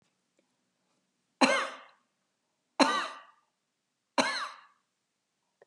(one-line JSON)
{"three_cough_length": "5.7 s", "three_cough_amplitude": 13812, "three_cough_signal_mean_std_ratio": 0.28, "survey_phase": "beta (2021-08-13 to 2022-03-07)", "age": "65+", "gender": "Female", "wearing_mask": "No", "symptom_none": true, "smoker_status": "Ex-smoker", "respiratory_condition_asthma": false, "respiratory_condition_other": false, "recruitment_source": "REACT", "submission_delay": "5 days", "covid_test_result": "Negative", "covid_test_method": "RT-qPCR", "influenza_a_test_result": "Negative", "influenza_b_test_result": "Negative"}